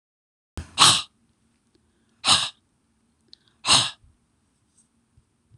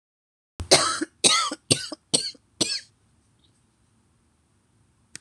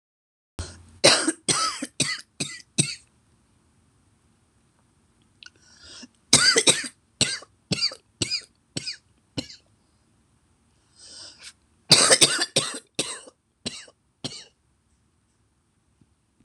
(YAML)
exhalation_length: 5.6 s
exhalation_amplitude: 26027
exhalation_signal_mean_std_ratio: 0.27
cough_length: 5.2 s
cough_amplitude: 26027
cough_signal_mean_std_ratio: 0.32
three_cough_length: 16.4 s
three_cough_amplitude: 26028
three_cough_signal_mean_std_ratio: 0.3
survey_phase: beta (2021-08-13 to 2022-03-07)
age: 65+
gender: Female
wearing_mask: 'No'
symptom_cough_any: true
smoker_status: Ex-smoker
respiratory_condition_asthma: true
respiratory_condition_other: false
recruitment_source: REACT
submission_delay: 1 day
covid_test_result: Negative
covid_test_method: RT-qPCR
influenza_a_test_result: Negative
influenza_b_test_result: Negative